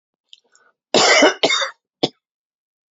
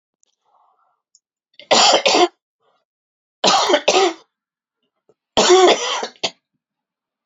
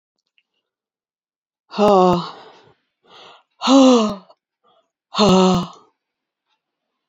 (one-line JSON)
{"cough_length": "2.9 s", "cough_amplitude": 30647, "cough_signal_mean_std_ratio": 0.39, "three_cough_length": "7.3 s", "three_cough_amplitude": 29144, "three_cough_signal_mean_std_ratio": 0.41, "exhalation_length": "7.1 s", "exhalation_amplitude": 29406, "exhalation_signal_mean_std_ratio": 0.36, "survey_phase": "beta (2021-08-13 to 2022-03-07)", "age": "65+", "gender": "Female", "wearing_mask": "No", "symptom_none": true, "smoker_status": "Ex-smoker", "respiratory_condition_asthma": false, "respiratory_condition_other": false, "recruitment_source": "REACT", "submission_delay": "2 days", "covid_test_result": "Negative", "covid_test_method": "RT-qPCR", "influenza_a_test_result": "Negative", "influenza_b_test_result": "Negative"}